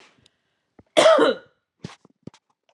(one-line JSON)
{"cough_length": "2.7 s", "cough_amplitude": 28461, "cough_signal_mean_std_ratio": 0.32, "survey_phase": "alpha (2021-03-01 to 2021-08-12)", "age": "45-64", "gender": "Female", "wearing_mask": "No", "symptom_none": true, "smoker_status": "Never smoked", "respiratory_condition_asthma": false, "respiratory_condition_other": false, "recruitment_source": "REACT", "submission_delay": "2 days", "covid_test_result": "Negative", "covid_test_method": "RT-qPCR"}